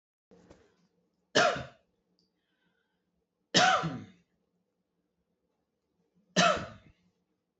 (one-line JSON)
{"three_cough_length": "7.6 s", "three_cough_amplitude": 13830, "three_cough_signal_mean_std_ratio": 0.27, "survey_phase": "beta (2021-08-13 to 2022-03-07)", "age": "18-44", "gender": "Female", "wearing_mask": "No", "symptom_none": true, "symptom_onset": "4 days", "smoker_status": "Never smoked", "respiratory_condition_asthma": false, "respiratory_condition_other": false, "recruitment_source": "REACT", "submission_delay": "2 days", "covid_test_result": "Negative", "covid_test_method": "RT-qPCR", "influenza_a_test_result": "Unknown/Void", "influenza_b_test_result": "Unknown/Void"}